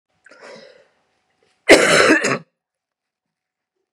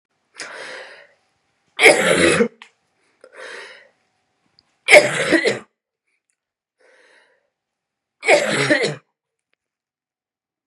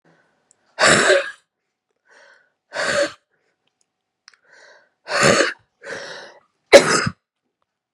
{"cough_length": "3.9 s", "cough_amplitude": 32768, "cough_signal_mean_std_ratio": 0.32, "three_cough_length": "10.7 s", "three_cough_amplitude": 32768, "three_cough_signal_mean_std_ratio": 0.33, "exhalation_length": "7.9 s", "exhalation_amplitude": 32768, "exhalation_signal_mean_std_ratio": 0.33, "survey_phase": "beta (2021-08-13 to 2022-03-07)", "age": "45-64", "gender": "Female", "wearing_mask": "No", "symptom_cough_any": true, "symptom_runny_or_blocked_nose": true, "symptom_shortness_of_breath": true, "symptom_sore_throat": true, "symptom_diarrhoea": true, "symptom_fatigue": true, "symptom_fever_high_temperature": true, "symptom_headache": true, "symptom_other": true, "smoker_status": "Never smoked", "respiratory_condition_asthma": true, "respiratory_condition_other": false, "recruitment_source": "Test and Trace", "submission_delay": "2 days", "covid_test_result": "Positive", "covid_test_method": "RT-qPCR"}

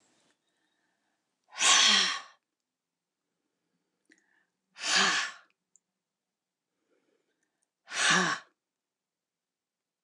{"exhalation_length": "10.0 s", "exhalation_amplitude": 10842, "exhalation_signal_mean_std_ratio": 0.3, "survey_phase": "alpha (2021-03-01 to 2021-08-12)", "age": "65+", "gender": "Female", "wearing_mask": "No", "symptom_change_to_sense_of_smell_or_taste": true, "smoker_status": "Never smoked", "respiratory_condition_asthma": false, "respiratory_condition_other": false, "recruitment_source": "REACT", "submission_delay": "2 days", "covid_test_result": "Negative", "covid_test_method": "RT-qPCR"}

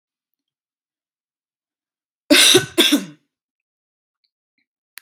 {"cough_length": "5.0 s", "cough_amplitude": 32768, "cough_signal_mean_std_ratio": 0.26, "survey_phase": "beta (2021-08-13 to 2022-03-07)", "age": "18-44", "gender": "Female", "wearing_mask": "No", "symptom_none": true, "smoker_status": "Never smoked", "respiratory_condition_asthma": false, "respiratory_condition_other": false, "recruitment_source": "REACT", "submission_delay": "1 day", "covid_test_method": "RT-qPCR"}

